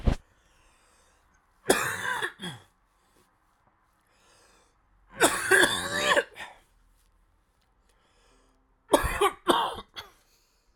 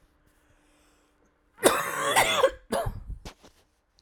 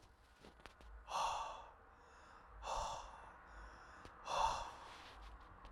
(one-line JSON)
{"three_cough_length": "10.8 s", "three_cough_amplitude": 19224, "three_cough_signal_mean_std_ratio": 0.35, "cough_length": "4.0 s", "cough_amplitude": 23863, "cough_signal_mean_std_ratio": 0.41, "exhalation_length": "5.7 s", "exhalation_amplitude": 1808, "exhalation_signal_mean_std_ratio": 0.58, "survey_phase": "alpha (2021-03-01 to 2021-08-12)", "age": "45-64", "gender": "Male", "wearing_mask": "No", "symptom_cough_any": true, "symptom_shortness_of_breath": true, "symptom_abdominal_pain": true, "symptom_fatigue": true, "symptom_headache": true, "symptom_onset": "3 days", "smoker_status": "Never smoked", "respiratory_condition_asthma": false, "respiratory_condition_other": false, "recruitment_source": "Test and Trace", "submission_delay": "2 days", "covid_test_result": "Positive", "covid_test_method": "RT-qPCR", "covid_ct_value": 17.2, "covid_ct_gene": "ORF1ab gene", "covid_ct_mean": 17.9, "covid_viral_load": "1300000 copies/ml", "covid_viral_load_category": "High viral load (>1M copies/ml)"}